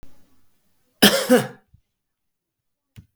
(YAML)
cough_length: 3.2 s
cough_amplitude: 32766
cough_signal_mean_std_ratio: 0.27
survey_phase: beta (2021-08-13 to 2022-03-07)
age: 45-64
gender: Male
wearing_mask: 'No'
symptom_none: true
smoker_status: Never smoked
respiratory_condition_asthma: false
respiratory_condition_other: true
recruitment_source: REACT
submission_delay: 1 day
covid_test_result: Negative
covid_test_method: RT-qPCR
influenza_a_test_result: Negative
influenza_b_test_result: Negative